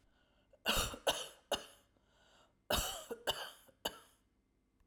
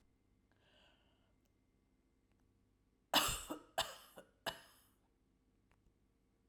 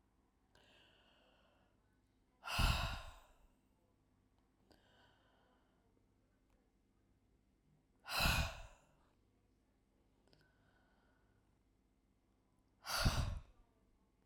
{"cough_length": "4.9 s", "cough_amplitude": 3497, "cough_signal_mean_std_ratio": 0.39, "three_cough_length": "6.5 s", "three_cough_amplitude": 3612, "three_cough_signal_mean_std_ratio": 0.24, "exhalation_length": "14.3 s", "exhalation_amplitude": 3132, "exhalation_signal_mean_std_ratio": 0.28, "survey_phase": "alpha (2021-03-01 to 2021-08-12)", "age": "45-64", "gender": "Female", "wearing_mask": "No", "symptom_none": true, "smoker_status": "Never smoked", "respiratory_condition_asthma": false, "respiratory_condition_other": false, "recruitment_source": "REACT", "submission_delay": "3 days", "covid_test_result": "Negative", "covid_test_method": "RT-qPCR"}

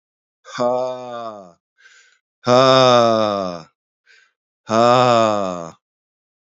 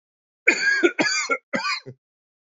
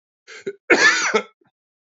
{"exhalation_length": "6.6 s", "exhalation_amplitude": 28528, "exhalation_signal_mean_std_ratio": 0.46, "three_cough_length": "2.6 s", "three_cough_amplitude": 25262, "three_cough_signal_mean_std_ratio": 0.51, "cough_length": "1.9 s", "cough_amplitude": 29188, "cough_signal_mean_std_ratio": 0.42, "survey_phase": "beta (2021-08-13 to 2022-03-07)", "age": "45-64", "gender": "Male", "wearing_mask": "No", "symptom_cough_any": true, "symptom_new_continuous_cough": true, "symptom_runny_or_blocked_nose": true, "symptom_shortness_of_breath": true, "symptom_sore_throat": true, "symptom_fatigue": true, "symptom_fever_high_temperature": true, "symptom_headache": true, "symptom_change_to_sense_of_smell_or_taste": true, "symptom_loss_of_taste": true, "smoker_status": "Never smoked", "respiratory_condition_asthma": false, "respiratory_condition_other": false, "recruitment_source": "Test and Trace", "submission_delay": "1 day", "covid_test_result": "Positive", "covid_test_method": "RT-qPCR"}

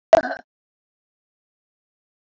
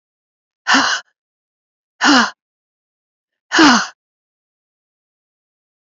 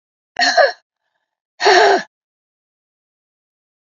{"cough_length": "2.2 s", "cough_amplitude": 27296, "cough_signal_mean_std_ratio": 0.16, "exhalation_length": "5.9 s", "exhalation_amplitude": 30137, "exhalation_signal_mean_std_ratio": 0.31, "three_cough_length": "3.9 s", "three_cough_amplitude": 30052, "three_cough_signal_mean_std_ratio": 0.34, "survey_phase": "beta (2021-08-13 to 2022-03-07)", "age": "65+", "gender": "Female", "wearing_mask": "No", "symptom_cough_any": true, "symptom_runny_or_blocked_nose": true, "symptom_sore_throat": true, "symptom_fatigue": true, "symptom_headache": true, "symptom_onset": "5 days", "smoker_status": "Never smoked", "respiratory_condition_asthma": false, "respiratory_condition_other": false, "recruitment_source": "Test and Trace", "submission_delay": "1 day", "covid_test_result": "Positive", "covid_test_method": "RT-qPCR", "covid_ct_value": 16.7, "covid_ct_gene": "ORF1ab gene", "covid_ct_mean": 17.3, "covid_viral_load": "2000000 copies/ml", "covid_viral_load_category": "High viral load (>1M copies/ml)"}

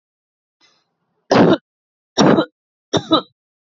{"three_cough_length": "3.8 s", "three_cough_amplitude": 29560, "three_cough_signal_mean_std_ratio": 0.35, "survey_phase": "alpha (2021-03-01 to 2021-08-12)", "age": "18-44", "gender": "Female", "wearing_mask": "No", "symptom_none": true, "smoker_status": "Never smoked", "respiratory_condition_asthma": false, "respiratory_condition_other": false, "recruitment_source": "REACT", "submission_delay": "3 days", "covid_test_result": "Negative", "covid_test_method": "RT-qPCR"}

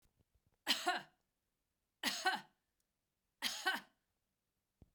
{"three_cough_length": "4.9 s", "three_cough_amplitude": 3510, "three_cough_signal_mean_std_ratio": 0.33, "survey_phase": "beta (2021-08-13 to 2022-03-07)", "age": "45-64", "gender": "Female", "wearing_mask": "No", "symptom_none": true, "smoker_status": "Ex-smoker", "respiratory_condition_asthma": false, "respiratory_condition_other": false, "recruitment_source": "Test and Trace", "submission_delay": "1 day", "covid_test_result": "Negative", "covid_test_method": "RT-qPCR"}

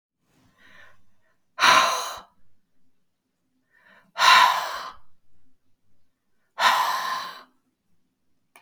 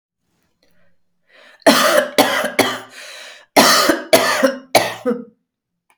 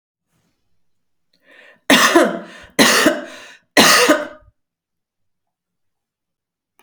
{"exhalation_length": "8.6 s", "exhalation_amplitude": 25645, "exhalation_signal_mean_std_ratio": 0.35, "cough_length": "6.0 s", "cough_amplitude": 32768, "cough_signal_mean_std_ratio": 0.48, "three_cough_length": "6.8 s", "three_cough_amplitude": 32768, "three_cough_signal_mean_std_ratio": 0.36, "survey_phase": "beta (2021-08-13 to 2022-03-07)", "age": "45-64", "gender": "Female", "wearing_mask": "No", "symptom_fatigue": true, "smoker_status": "Ex-smoker", "respiratory_condition_asthma": false, "respiratory_condition_other": false, "recruitment_source": "REACT", "submission_delay": "1 day", "covid_test_result": "Negative", "covid_test_method": "RT-qPCR", "influenza_a_test_result": "Negative", "influenza_b_test_result": "Negative"}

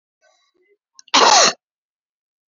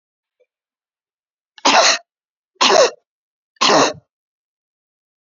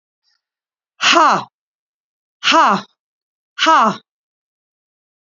{"cough_length": "2.5 s", "cough_amplitude": 32767, "cough_signal_mean_std_ratio": 0.32, "three_cough_length": "5.2 s", "three_cough_amplitude": 30550, "three_cough_signal_mean_std_ratio": 0.34, "exhalation_length": "5.3 s", "exhalation_amplitude": 31638, "exhalation_signal_mean_std_ratio": 0.36, "survey_phase": "beta (2021-08-13 to 2022-03-07)", "age": "65+", "gender": "Female", "wearing_mask": "No", "symptom_none": true, "smoker_status": "Never smoked", "respiratory_condition_asthma": false, "respiratory_condition_other": false, "recruitment_source": "REACT", "submission_delay": "3 days", "covid_test_result": "Negative", "covid_test_method": "RT-qPCR", "influenza_a_test_result": "Negative", "influenza_b_test_result": "Negative"}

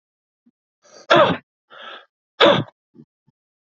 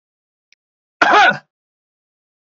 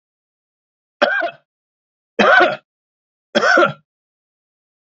{"exhalation_length": "3.7 s", "exhalation_amplitude": 31267, "exhalation_signal_mean_std_ratio": 0.3, "cough_length": "2.6 s", "cough_amplitude": 32768, "cough_signal_mean_std_ratio": 0.3, "three_cough_length": "4.9 s", "three_cough_amplitude": 29646, "three_cough_signal_mean_std_ratio": 0.36, "survey_phase": "beta (2021-08-13 to 2022-03-07)", "age": "45-64", "gender": "Male", "wearing_mask": "No", "symptom_runny_or_blocked_nose": true, "symptom_fatigue": true, "smoker_status": "Never smoked", "respiratory_condition_asthma": false, "respiratory_condition_other": false, "recruitment_source": "Test and Trace", "submission_delay": "2 days", "covid_test_result": "Positive", "covid_test_method": "RT-qPCR", "covid_ct_value": 18.4, "covid_ct_gene": "S gene"}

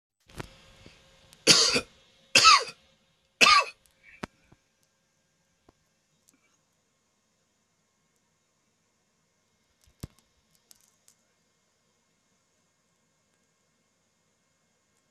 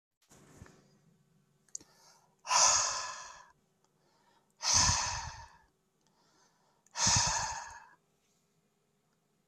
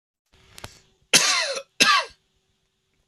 {"three_cough_length": "15.1 s", "three_cough_amplitude": 23333, "three_cough_signal_mean_std_ratio": 0.19, "exhalation_length": "9.5 s", "exhalation_amplitude": 8147, "exhalation_signal_mean_std_ratio": 0.36, "cough_length": "3.1 s", "cough_amplitude": 27429, "cough_signal_mean_std_ratio": 0.36, "survey_phase": "alpha (2021-03-01 to 2021-08-12)", "age": "45-64", "gender": "Male", "wearing_mask": "No", "symptom_none": true, "smoker_status": "Ex-smoker", "respiratory_condition_asthma": false, "respiratory_condition_other": false, "recruitment_source": "REACT", "submission_delay": "5 days", "covid_test_result": "Negative", "covid_test_method": "RT-qPCR"}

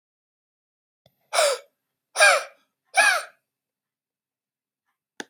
{"exhalation_length": "5.3 s", "exhalation_amplitude": 23146, "exhalation_signal_mean_std_ratio": 0.29, "survey_phase": "beta (2021-08-13 to 2022-03-07)", "age": "45-64", "gender": "Male", "wearing_mask": "No", "symptom_fatigue": true, "symptom_headache": true, "symptom_change_to_sense_of_smell_or_taste": true, "symptom_onset": "6 days", "smoker_status": "Never smoked", "respiratory_condition_asthma": false, "respiratory_condition_other": false, "recruitment_source": "Test and Trace", "submission_delay": "2 days", "covid_test_result": "Positive", "covid_test_method": "RT-qPCR"}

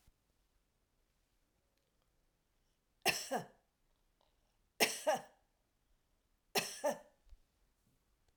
{"three_cough_length": "8.4 s", "three_cough_amplitude": 5566, "three_cough_signal_mean_std_ratio": 0.26, "survey_phase": "alpha (2021-03-01 to 2021-08-12)", "age": "45-64", "gender": "Female", "wearing_mask": "No", "symptom_none": true, "smoker_status": "Never smoked", "respiratory_condition_asthma": false, "respiratory_condition_other": false, "recruitment_source": "REACT", "submission_delay": "1 day", "covid_test_result": "Negative", "covid_test_method": "RT-qPCR"}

